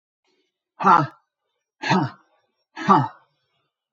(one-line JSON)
{"exhalation_length": "3.9 s", "exhalation_amplitude": 25700, "exhalation_signal_mean_std_ratio": 0.33, "survey_phase": "alpha (2021-03-01 to 2021-08-12)", "age": "65+", "gender": "Male", "wearing_mask": "No", "symptom_none": true, "smoker_status": "Ex-smoker", "respiratory_condition_asthma": false, "respiratory_condition_other": false, "recruitment_source": "REACT", "submission_delay": "2 days", "covid_test_result": "Negative", "covid_test_method": "RT-qPCR"}